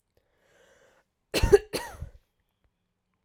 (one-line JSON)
{"cough_length": "3.2 s", "cough_amplitude": 20295, "cough_signal_mean_std_ratio": 0.21, "survey_phase": "alpha (2021-03-01 to 2021-08-12)", "age": "18-44", "gender": "Female", "wearing_mask": "No", "symptom_fever_high_temperature": true, "symptom_headache": true, "symptom_loss_of_taste": true, "symptom_onset": "2 days", "smoker_status": "Never smoked", "respiratory_condition_asthma": false, "respiratory_condition_other": false, "recruitment_source": "Test and Trace", "submission_delay": "2 days", "covid_test_result": "Positive", "covid_test_method": "RT-qPCR", "covid_ct_value": 22.5, "covid_ct_gene": "ORF1ab gene"}